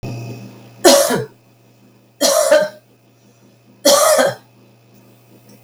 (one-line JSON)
{"three_cough_length": "5.6 s", "three_cough_amplitude": 32768, "three_cough_signal_mean_std_ratio": 0.44, "survey_phase": "beta (2021-08-13 to 2022-03-07)", "age": "45-64", "gender": "Female", "wearing_mask": "No", "symptom_none": true, "smoker_status": "Never smoked", "respiratory_condition_asthma": false, "respiratory_condition_other": false, "recruitment_source": "REACT", "submission_delay": "2 days", "covid_test_result": "Negative", "covid_test_method": "RT-qPCR", "influenza_a_test_result": "Negative", "influenza_b_test_result": "Negative"}